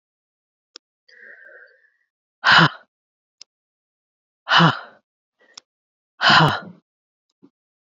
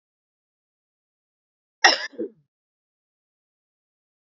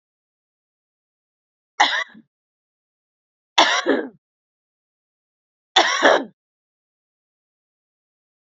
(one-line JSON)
{"exhalation_length": "7.9 s", "exhalation_amplitude": 28352, "exhalation_signal_mean_std_ratio": 0.27, "cough_length": "4.4 s", "cough_amplitude": 32767, "cough_signal_mean_std_ratio": 0.15, "three_cough_length": "8.4 s", "three_cough_amplitude": 32767, "three_cough_signal_mean_std_ratio": 0.26, "survey_phase": "beta (2021-08-13 to 2022-03-07)", "age": "18-44", "gender": "Female", "wearing_mask": "No", "symptom_new_continuous_cough": true, "symptom_fatigue": true, "symptom_onset": "4 days", "smoker_status": "Ex-smoker", "respiratory_condition_asthma": false, "respiratory_condition_other": false, "recruitment_source": "Test and Trace", "submission_delay": "2 days", "covid_test_result": "Positive", "covid_test_method": "RT-qPCR", "covid_ct_value": 14.4, "covid_ct_gene": "ORF1ab gene"}